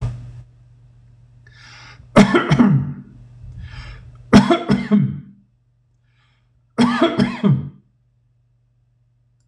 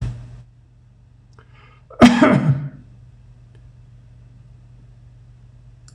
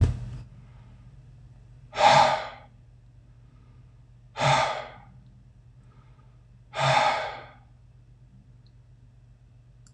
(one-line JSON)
{"three_cough_length": "9.5 s", "three_cough_amplitude": 26028, "three_cough_signal_mean_std_ratio": 0.41, "cough_length": "5.9 s", "cough_amplitude": 26028, "cough_signal_mean_std_ratio": 0.3, "exhalation_length": "9.9 s", "exhalation_amplitude": 20378, "exhalation_signal_mean_std_ratio": 0.37, "survey_phase": "beta (2021-08-13 to 2022-03-07)", "age": "65+", "gender": "Male", "wearing_mask": "No", "symptom_runny_or_blocked_nose": true, "symptom_onset": "12 days", "smoker_status": "Never smoked", "respiratory_condition_asthma": false, "respiratory_condition_other": false, "recruitment_source": "REACT", "submission_delay": "1 day", "covid_test_result": "Negative", "covid_test_method": "RT-qPCR", "influenza_a_test_result": "Negative", "influenza_b_test_result": "Negative"}